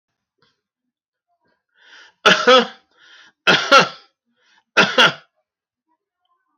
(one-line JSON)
{"three_cough_length": "6.6 s", "three_cough_amplitude": 28481, "three_cough_signal_mean_std_ratio": 0.31, "survey_phase": "beta (2021-08-13 to 2022-03-07)", "age": "65+", "gender": "Male", "wearing_mask": "No", "symptom_none": true, "smoker_status": "Never smoked", "respiratory_condition_asthma": false, "respiratory_condition_other": false, "recruitment_source": "REACT", "submission_delay": "3 days", "covid_test_result": "Negative", "covid_test_method": "RT-qPCR"}